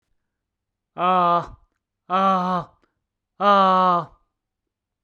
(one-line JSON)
{"exhalation_length": "5.0 s", "exhalation_amplitude": 19074, "exhalation_signal_mean_std_ratio": 0.48, "survey_phase": "beta (2021-08-13 to 2022-03-07)", "age": "45-64", "gender": "Male", "wearing_mask": "No", "symptom_none": true, "smoker_status": "Ex-smoker", "respiratory_condition_asthma": false, "respiratory_condition_other": false, "recruitment_source": "REACT", "submission_delay": "1 day", "covid_test_result": "Negative", "covid_test_method": "RT-qPCR"}